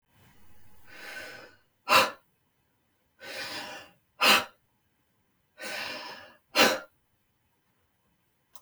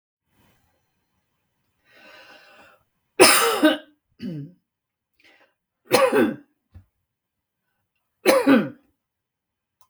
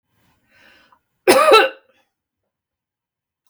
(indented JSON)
{
  "exhalation_length": "8.6 s",
  "exhalation_amplitude": 19031,
  "exhalation_signal_mean_std_ratio": 0.3,
  "three_cough_length": "9.9 s",
  "three_cough_amplitude": 32766,
  "three_cough_signal_mean_std_ratio": 0.3,
  "cough_length": "3.5 s",
  "cough_amplitude": 32768,
  "cough_signal_mean_std_ratio": 0.28,
  "survey_phase": "beta (2021-08-13 to 2022-03-07)",
  "age": "45-64",
  "gender": "Female",
  "wearing_mask": "No",
  "symptom_none": true,
  "smoker_status": "Never smoked",
  "respiratory_condition_asthma": false,
  "respiratory_condition_other": false,
  "recruitment_source": "REACT",
  "submission_delay": "0 days",
  "covid_test_result": "Negative",
  "covid_test_method": "RT-qPCR",
  "influenza_a_test_result": "Negative",
  "influenza_b_test_result": "Negative"
}